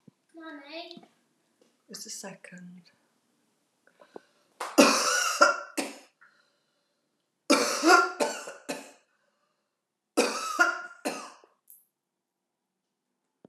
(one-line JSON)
{"three_cough_length": "13.5 s", "three_cough_amplitude": 22178, "three_cough_signal_mean_std_ratio": 0.33, "survey_phase": "beta (2021-08-13 to 2022-03-07)", "age": "65+", "gender": "Female", "wearing_mask": "No", "symptom_none": true, "smoker_status": "Never smoked", "respiratory_condition_asthma": false, "respiratory_condition_other": false, "recruitment_source": "REACT", "submission_delay": "16 days", "covid_test_result": "Negative", "covid_test_method": "RT-qPCR"}